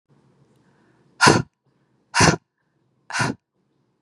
exhalation_length: 4.0 s
exhalation_amplitude: 31475
exhalation_signal_mean_std_ratio: 0.29
survey_phase: beta (2021-08-13 to 2022-03-07)
age: 45-64
gender: Female
wearing_mask: 'No'
symptom_none: true
smoker_status: Never smoked
respiratory_condition_asthma: false
respiratory_condition_other: false
recruitment_source: REACT
submission_delay: 0 days
covid_test_result: Negative
covid_test_method: RT-qPCR
influenza_a_test_result: Negative
influenza_b_test_result: Negative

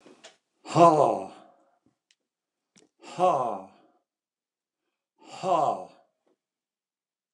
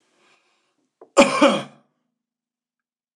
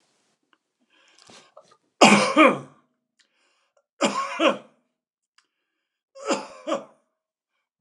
exhalation_length: 7.3 s
exhalation_amplitude: 20886
exhalation_signal_mean_std_ratio: 0.3
cough_length: 3.2 s
cough_amplitude: 29203
cough_signal_mean_std_ratio: 0.26
three_cough_length: 7.8 s
three_cough_amplitude: 29203
three_cough_signal_mean_std_ratio: 0.28
survey_phase: alpha (2021-03-01 to 2021-08-12)
age: 65+
gender: Male
wearing_mask: 'No'
symptom_none: true
smoker_status: Never smoked
respiratory_condition_asthma: false
respiratory_condition_other: false
recruitment_source: REACT
submission_delay: 2 days
covid_test_result: Negative
covid_test_method: RT-qPCR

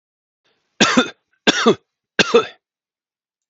three_cough_length: 3.5 s
three_cough_amplitude: 30798
three_cough_signal_mean_std_ratio: 0.34
survey_phase: beta (2021-08-13 to 2022-03-07)
age: 45-64
gender: Male
wearing_mask: 'No'
symptom_none: true
smoker_status: Never smoked
respiratory_condition_asthma: false
respiratory_condition_other: false
recruitment_source: REACT
submission_delay: 2 days
covid_test_result: Negative
covid_test_method: RT-qPCR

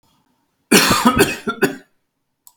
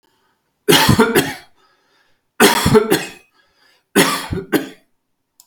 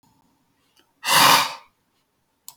cough_length: 2.6 s
cough_amplitude: 32768
cough_signal_mean_std_ratio: 0.44
three_cough_length: 5.5 s
three_cough_amplitude: 32768
three_cough_signal_mean_std_ratio: 0.44
exhalation_length: 2.6 s
exhalation_amplitude: 32766
exhalation_signal_mean_std_ratio: 0.33
survey_phase: beta (2021-08-13 to 2022-03-07)
age: 65+
gender: Male
wearing_mask: 'No'
symptom_none: true
smoker_status: Never smoked
respiratory_condition_asthma: false
respiratory_condition_other: false
recruitment_source: REACT
submission_delay: 7 days
covid_test_result: Negative
covid_test_method: RT-qPCR
influenza_a_test_result: Negative
influenza_b_test_result: Negative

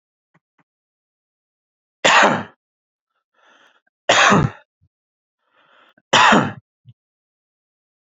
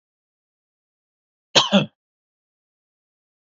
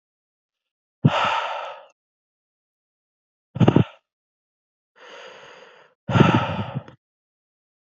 three_cough_length: 8.2 s
three_cough_amplitude: 30876
three_cough_signal_mean_std_ratio: 0.3
cough_length: 3.5 s
cough_amplitude: 32767
cough_signal_mean_std_ratio: 0.19
exhalation_length: 7.9 s
exhalation_amplitude: 29145
exhalation_signal_mean_std_ratio: 0.3
survey_phase: beta (2021-08-13 to 2022-03-07)
age: 18-44
gender: Male
wearing_mask: 'No'
symptom_none: true
smoker_status: Never smoked
respiratory_condition_asthma: false
respiratory_condition_other: false
recruitment_source: REACT
submission_delay: 1 day
covid_test_result: Negative
covid_test_method: RT-qPCR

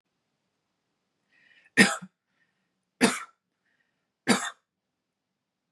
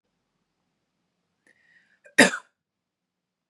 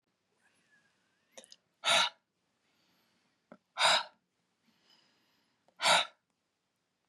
three_cough_length: 5.7 s
three_cough_amplitude: 21235
three_cough_signal_mean_std_ratio: 0.21
cough_length: 3.5 s
cough_amplitude: 27039
cough_signal_mean_std_ratio: 0.15
exhalation_length: 7.1 s
exhalation_amplitude: 8143
exhalation_signal_mean_std_ratio: 0.26
survey_phase: beta (2021-08-13 to 2022-03-07)
age: 18-44
gender: Female
wearing_mask: 'No'
symptom_none: true
smoker_status: Never smoked
respiratory_condition_asthma: false
respiratory_condition_other: false
recruitment_source: REACT
submission_delay: 1 day
covid_test_result: Negative
covid_test_method: RT-qPCR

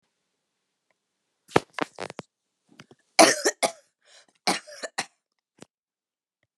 cough_length: 6.6 s
cough_amplitude: 32004
cough_signal_mean_std_ratio: 0.21
survey_phase: beta (2021-08-13 to 2022-03-07)
age: 65+
gender: Female
wearing_mask: 'No'
symptom_runny_or_blocked_nose: true
smoker_status: Never smoked
respiratory_condition_asthma: false
respiratory_condition_other: false
recruitment_source: REACT
submission_delay: 7 days
covid_test_result: Negative
covid_test_method: RT-qPCR
influenza_a_test_result: Negative
influenza_b_test_result: Negative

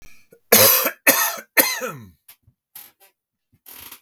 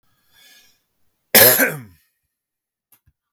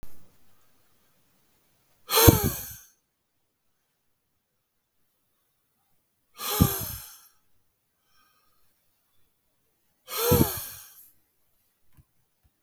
three_cough_length: 4.0 s
three_cough_amplitude: 32768
three_cough_signal_mean_std_ratio: 0.38
cough_length: 3.3 s
cough_amplitude: 32768
cough_signal_mean_std_ratio: 0.27
exhalation_length: 12.6 s
exhalation_amplitude: 32768
exhalation_signal_mean_std_ratio: 0.24
survey_phase: beta (2021-08-13 to 2022-03-07)
age: 45-64
gender: Male
wearing_mask: 'No'
symptom_sore_throat: true
symptom_onset: 12 days
smoker_status: Ex-smoker
respiratory_condition_asthma: false
respiratory_condition_other: false
recruitment_source: REACT
submission_delay: 2 days
covid_test_result: Negative
covid_test_method: RT-qPCR
influenza_a_test_result: Negative
influenza_b_test_result: Negative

